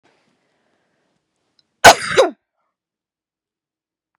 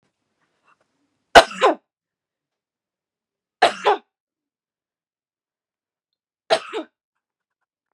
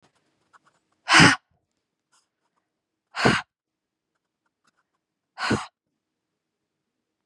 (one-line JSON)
{"cough_length": "4.2 s", "cough_amplitude": 32768, "cough_signal_mean_std_ratio": 0.19, "three_cough_length": "7.9 s", "three_cough_amplitude": 32768, "three_cough_signal_mean_std_ratio": 0.18, "exhalation_length": "7.3 s", "exhalation_amplitude": 28160, "exhalation_signal_mean_std_ratio": 0.22, "survey_phase": "beta (2021-08-13 to 2022-03-07)", "age": "18-44", "gender": "Female", "wearing_mask": "No", "symptom_none": true, "smoker_status": "Current smoker (1 to 10 cigarettes per day)", "respiratory_condition_asthma": false, "respiratory_condition_other": false, "recruitment_source": "REACT", "submission_delay": "1 day", "covid_test_result": "Negative", "covid_test_method": "RT-qPCR", "influenza_a_test_result": "Negative", "influenza_b_test_result": "Negative"}